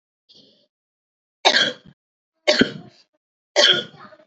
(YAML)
three_cough_length: 4.3 s
three_cough_amplitude: 29831
three_cough_signal_mean_std_ratio: 0.32
survey_phase: beta (2021-08-13 to 2022-03-07)
age: 18-44
gender: Female
wearing_mask: 'No'
symptom_cough_any: true
symptom_runny_or_blocked_nose: true
symptom_sore_throat: true
symptom_fatigue: true
symptom_fever_high_temperature: true
symptom_change_to_sense_of_smell_or_taste: true
symptom_loss_of_taste: true
symptom_onset: 4 days
smoker_status: Never smoked
respiratory_condition_asthma: false
respiratory_condition_other: false
recruitment_source: Test and Trace
submission_delay: 3 days
covid_test_result: Positive
covid_test_method: ePCR